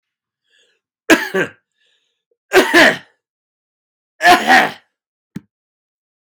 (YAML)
three_cough_length: 6.3 s
three_cough_amplitude: 32768
three_cough_signal_mean_std_ratio: 0.33
survey_phase: beta (2021-08-13 to 2022-03-07)
age: 65+
gender: Male
wearing_mask: 'No'
symptom_none: true
smoker_status: Ex-smoker
respiratory_condition_asthma: false
respiratory_condition_other: false
recruitment_source: REACT
submission_delay: 2 days
covid_test_result: Negative
covid_test_method: RT-qPCR
influenza_a_test_result: Negative
influenza_b_test_result: Negative